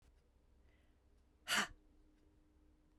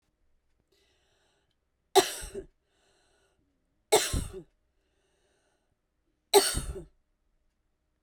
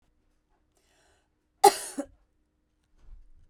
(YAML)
exhalation_length: 3.0 s
exhalation_amplitude: 2589
exhalation_signal_mean_std_ratio: 0.26
three_cough_length: 8.0 s
three_cough_amplitude: 15410
three_cough_signal_mean_std_ratio: 0.23
cough_length: 3.5 s
cough_amplitude: 20476
cough_signal_mean_std_ratio: 0.16
survey_phase: beta (2021-08-13 to 2022-03-07)
age: 18-44
gender: Female
wearing_mask: 'No'
symptom_cough_any: true
symptom_new_continuous_cough: true
symptom_runny_or_blocked_nose: true
symptom_shortness_of_breath: true
symptom_sore_throat: true
symptom_fatigue: true
symptom_onset: 2 days
smoker_status: Ex-smoker
respiratory_condition_asthma: false
respiratory_condition_other: false
recruitment_source: Test and Trace
submission_delay: 1 day
covid_test_result: Positive
covid_test_method: RT-qPCR
covid_ct_value: 23.4
covid_ct_gene: S gene
covid_ct_mean: 23.8
covid_viral_load: 16000 copies/ml
covid_viral_load_category: Low viral load (10K-1M copies/ml)